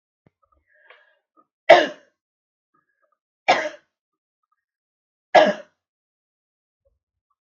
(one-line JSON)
{"three_cough_length": "7.6 s", "three_cough_amplitude": 32768, "three_cough_signal_mean_std_ratio": 0.19, "survey_phase": "beta (2021-08-13 to 2022-03-07)", "age": "65+", "gender": "Female", "wearing_mask": "No", "symptom_none": true, "smoker_status": "Never smoked", "respiratory_condition_asthma": false, "respiratory_condition_other": false, "recruitment_source": "REACT", "submission_delay": "3 days", "covid_test_result": "Negative", "covid_test_method": "RT-qPCR", "influenza_a_test_result": "Negative", "influenza_b_test_result": "Negative"}